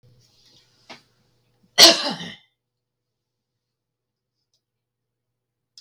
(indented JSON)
{
  "cough_length": "5.8 s",
  "cough_amplitude": 32768,
  "cough_signal_mean_std_ratio": 0.17,
  "survey_phase": "beta (2021-08-13 to 2022-03-07)",
  "age": "45-64",
  "gender": "Female",
  "wearing_mask": "No",
  "symptom_none": true,
  "smoker_status": "Ex-smoker",
  "respiratory_condition_asthma": false,
  "respiratory_condition_other": false,
  "recruitment_source": "REACT",
  "submission_delay": "1 day",
  "covid_test_result": "Negative",
  "covid_test_method": "RT-qPCR"
}